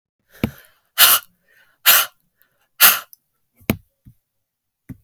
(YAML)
exhalation_length: 5.0 s
exhalation_amplitude: 32768
exhalation_signal_mean_std_ratio: 0.28
survey_phase: beta (2021-08-13 to 2022-03-07)
age: 45-64
gender: Female
wearing_mask: 'No'
symptom_new_continuous_cough: true
symptom_runny_or_blocked_nose: true
symptom_shortness_of_breath: true
symptom_sore_throat: true
symptom_fatigue: true
symptom_fever_high_temperature: true
symptom_headache: true
symptom_other: true
symptom_onset: 6 days
smoker_status: Ex-smoker
respiratory_condition_asthma: true
respiratory_condition_other: false
recruitment_source: Test and Trace
submission_delay: 5 days
covid_test_result: Positive
covid_test_method: ePCR